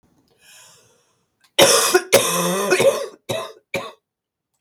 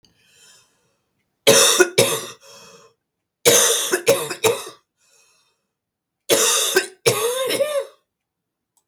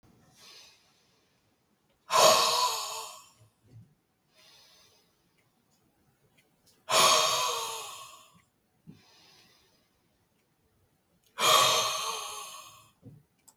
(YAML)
cough_length: 4.6 s
cough_amplitude: 32768
cough_signal_mean_std_ratio: 0.45
three_cough_length: 8.9 s
three_cough_amplitude: 32767
three_cough_signal_mean_std_ratio: 0.45
exhalation_length: 13.6 s
exhalation_amplitude: 15791
exhalation_signal_mean_std_ratio: 0.35
survey_phase: beta (2021-08-13 to 2022-03-07)
age: 45-64
gender: Female
wearing_mask: 'No'
symptom_new_continuous_cough: true
symptom_sore_throat: true
symptom_headache: true
symptom_onset: 1 day
smoker_status: Never smoked
respiratory_condition_asthma: false
respiratory_condition_other: false
recruitment_source: Test and Trace
submission_delay: 0 days
covid_test_result: Positive
covid_test_method: RT-qPCR
covid_ct_value: 28.5
covid_ct_gene: ORF1ab gene